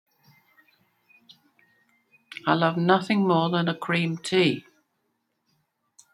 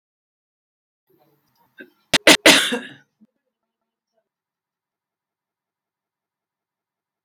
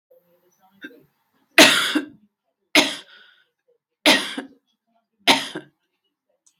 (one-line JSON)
{"exhalation_length": "6.1 s", "exhalation_amplitude": 18619, "exhalation_signal_mean_std_ratio": 0.45, "cough_length": "7.2 s", "cough_amplitude": 32768, "cough_signal_mean_std_ratio": 0.18, "three_cough_length": "6.6 s", "three_cough_amplitude": 32768, "three_cough_signal_mean_std_ratio": 0.29, "survey_phase": "beta (2021-08-13 to 2022-03-07)", "age": "65+", "gender": "Female", "wearing_mask": "No", "symptom_none": true, "smoker_status": "Ex-smoker", "respiratory_condition_asthma": false, "respiratory_condition_other": false, "recruitment_source": "REACT", "submission_delay": "8 days", "covid_test_result": "Negative", "covid_test_method": "RT-qPCR"}